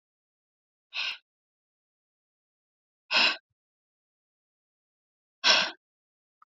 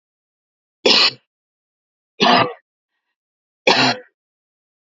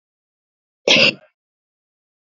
exhalation_length: 6.5 s
exhalation_amplitude: 14806
exhalation_signal_mean_std_ratio: 0.23
three_cough_length: 4.9 s
three_cough_amplitude: 32768
three_cough_signal_mean_std_ratio: 0.33
cough_length: 2.4 s
cough_amplitude: 30358
cough_signal_mean_std_ratio: 0.26
survey_phase: beta (2021-08-13 to 2022-03-07)
age: 18-44
gender: Female
wearing_mask: 'No'
symptom_runny_or_blocked_nose: true
symptom_shortness_of_breath: true
symptom_headache: true
symptom_onset: 12 days
smoker_status: Never smoked
respiratory_condition_asthma: false
respiratory_condition_other: false
recruitment_source: REACT
submission_delay: 2 days
covid_test_result: Negative
covid_test_method: RT-qPCR
influenza_a_test_result: Negative
influenza_b_test_result: Negative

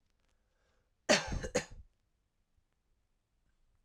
cough_length: 3.8 s
cough_amplitude: 6351
cough_signal_mean_std_ratio: 0.24
survey_phase: alpha (2021-03-01 to 2021-08-12)
age: 18-44
gender: Male
wearing_mask: 'No'
symptom_cough_any: true
symptom_shortness_of_breath: true
symptom_fatigue: true
symptom_onset: 3 days
smoker_status: Prefer not to say
respiratory_condition_asthma: false
respiratory_condition_other: false
recruitment_source: Test and Trace
submission_delay: 2 days
covid_test_result: Positive
covid_test_method: RT-qPCR
covid_ct_value: 32.2
covid_ct_gene: N gene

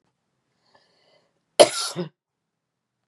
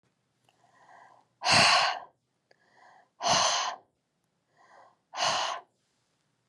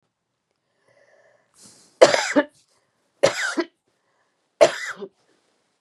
cough_length: 3.1 s
cough_amplitude: 32464
cough_signal_mean_std_ratio: 0.18
exhalation_length: 6.5 s
exhalation_amplitude: 13428
exhalation_signal_mean_std_ratio: 0.38
three_cough_length: 5.8 s
three_cough_amplitude: 32768
three_cough_signal_mean_std_ratio: 0.26
survey_phase: beta (2021-08-13 to 2022-03-07)
age: 45-64
gender: Female
wearing_mask: 'No'
symptom_cough_any: true
symptom_runny_or_blocked_nose: true
symptom_sore_throat: true
symptom_abdominal_pain: true
symptom_fatigue: true
symptom_headache: true
symptom_onset: 2 days
smoker_status: Ex-smoker
respiratory_condition_asthma: false
respiratory_condition_other: false
recruitment_source: Test and Trace
submission_delay: 2 days
covid_test_result: Positive
covid_test_method: RT-qPCR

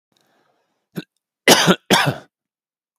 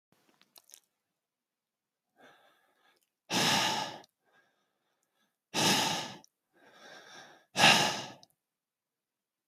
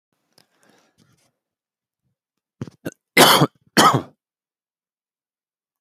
cough_length: 3.0 s
cough_amplitude: 32768
cough_signal_mean_std_ratio: 0.32
exhalation_length: 9.5 s
exhalation_amplitude: 12398
exhalation_signal_mean_std_ratio: 0.31
three_cough_length: 5.8 s
three_cough_amplitude: 32767
three_cough_signal_mean_std_ratio: 0.24
survey_phase: beta (2021-08-13 to 2022-03-07)
age: 45-64
gender: Male
wearing_mask: 'No'
symptom_none: true
smoker_status: Never smoked
respiratory_condition_asthma: false
respiratory_condition_other: false
recruitment_source: REACT
submission_delay: 2 days
covid_test_result: Negative
covid_test_method: RT-qPCR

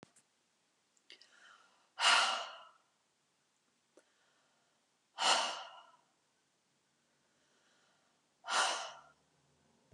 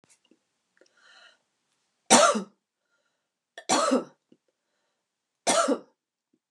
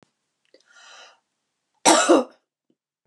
exhalation_length: 9.9 s
exhalation_amplitude: 5875
exhalation_signal_mean_std_ratio: 0.28
three_cough_length: 6.5 s
three_cough_amplitude: 23303
three_cough_signal_mean_std_ratio: 0.29
cough_length: 3.1 s
cough_amplitude: 29396
cough_signal_mean_std_ratio: 0.28
survey_phase: beta (2021-08-13 to 2022-03-07)
age: 45-64
gender: Female
wearing_mask: 'No'
symptom_none: true
smoker_status: Never smoked
respiratory_condition_asthma: true
respiratory_condition_other: false
recruitment_source: REACT
submission_delay: 1 day
covid_test_result: Negative
covid_test_method: RT-qPCR
influenza_a_test_result: Unknown/Void
influenza_b_test_result: Unknown/Void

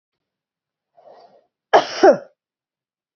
cough_length: 3.2 s
cough_amplitude: 27535
cough_signal_mean_std_ratio: 0.23
survey_phase: beta (2021-08-13 to 2022-03-07)
age: 45-64
gender: Female
wearing_mask: 'No'
symptom_none: true
smoker_status: Ex-smoker
respiratory_condition_asthma: false
respiratory_condition_other: false
recruitment_source: REACT
submission_delay: 1 day
covid_test_result: Negative
covid_test_method: RT-qPCR
influenza_a_test_result: Negative
influenza_b_test_result: Negative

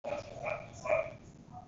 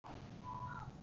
cough_length: 1.7 s
cough_amplitude: 4506
cough_signal_mean_std_ratio: 0.61
exhalation_length: 1.0 s
exhalation_amplitude: 501
exhalation_signal_mean_std_ratio: 1.03
survey_phase: beta (2021-08-13 to 2022-03-07)
age: 18-44
gender: Male
wearing_mask: 'No'
symptom_none: true
smoker_status: Never smoked
respiratory_condition_asthma: false
respiratory_condition_other: false
recruitment_source: REACT
submission_delay: 2 days
covid_test_result: Negative
covid_test_method: RT-qPCR
influenza_a_test_result: Negative
influenza_b_test_result: Negative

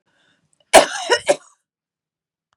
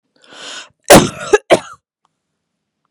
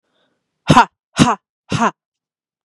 three_cough_length: 2.6 s
three_cough_amplitude: 32768
three_cough_signal_mean_std_ratio: 0.26
cough_length: 2.9 s
cough_amplitude: 32768
cough_signal_mean_std_ratio: 0.29
exhalation_length: 2.6 s
exhalation_amplitude: 32768
exhalation_signal_mean_std_ratio: 0.32
survey_phase: beta (2021-08-13 to 2022-03-07)
age: 18-44
gender: Female
wearing_mask: 'No'
symptom_none: true
smoker_status: Never smoked
respiratory_condition_asthma: false
respiratory_condition_other: false
recruitment_source: REACT
submission_delay: 2 days
covid_test_result: Negative
covid_test_method: RT-qPCR
influenza_a_test_result: Negative
influenza_b_test_result: Negative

